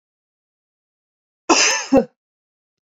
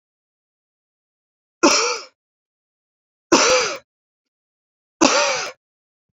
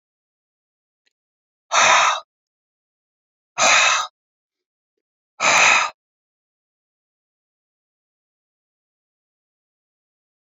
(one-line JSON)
{"cough_length": "2.8 s", "cough_amplitude": 29025, "cough_signal_mean_std_ratio": 0.31, "three_cough_length": "6.1 s", "three_cough_amplitude": 30705, "three_cough_signal_mean_std_ratio": 0.34, "exhalation_length": "10.6 s", "exhalation_amplitude": 28174, "exhalation_signal_mean_std_ratio": 0.29, "survey_phase": "beta (2021-08-13 to 2022-03-07)", "age": "45-64", "gender": "Female", "wearing_mask": "No", "symptom_none": true, "smoker_status": "Never smoked", "respiratory_condition_asthma": false, "respiratory_condition_other": false, "recruitment_source": "REACT", "submission_delay": "2 days", "covid_test_result": "Negative", "covid_test_method": "RT-qPCR", "influenza_a_test_result": "Unknown/Void", "influenza_b_test_result": "Unknown/Void"}